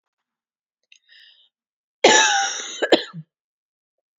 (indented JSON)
{
  "cough_length": "4.2 s",
  "cough_amplitude": 32767,
  "cough_signal_mean_std_ratio": 0.32,
  "survey_phase": "beta (2021-08-13 to 2022-03-07)",
  "age": "18-44",
  "gender": "Female",
  "wearing_mask": "No",
  "symptom_none": true,
  "smoker_status": "Never smoked",
  "respiratory_condition_asthma": false,
  "respiratory_condition_other": false,
  "recruitment_source": "REACT",
  "submission_delay": "1 day",
  "covid_test_result": "Negative",
  "covid_test_method": "RT-qPCR",
  "influenza_a_test_result": "Negative",
  "influenza_b_test_result": "Negative"
}